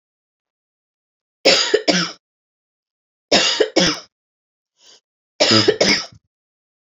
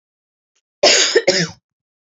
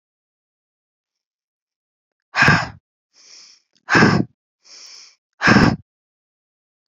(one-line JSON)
{"three_cough_length": "7.0 s", "three_cough_amplitude": 32768, "three_cough_signal_mean_std_ratio": 0.38, "cough_length": "2.1 s", "cough_amplitude": 31683, "cough_signal_mean_std_ratio": 0.42, "exhalation_length": "6.9 s", "exhalation_amplitude": 28315, "exhalation_signal_mean_std_ratio": 0.3, "survey_phase": "alpha (2021-03-01 to 2021-08-12)", "age": "18-44", "gender": "Female", "wearing_mask": "No", "symptom_none": true, "smoker_status": "Ex-smoker", "respiratory_condition_asthma": false, "respiratory_condition_other": false, "recruitment_source": "REACT", "submission_delay": "1 day", "covid_test_result": "Negative", "covid_test_method": "RT-qPCR", "covid_ct_value": 42.0, "covid_ct_gene": "N gene"}